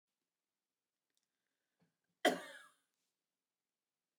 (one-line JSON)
{"cough_length": "4.2 s", "cough_amplitude": 4043, "cough_signal_mean_std_ratio": 0.15, "survey_phase": "beta (2021-08-13 to 2022-03-07)", "age": "45-64", "gender": "Female", "wearing_mask": "Yes", "symptom_none": true, "smoker_status": "Ex-smoker", "respiratory_condition_asthma": false, "respiratory_condition_other": false, "recruitment_source": "REACT", "submission_delay": "1 day", "covid_test_result": "Negative", "covid_test_method": "RT-qPCR", "influenza_a_test_result": "Negative", "influenza_b_test_result": "Negative"}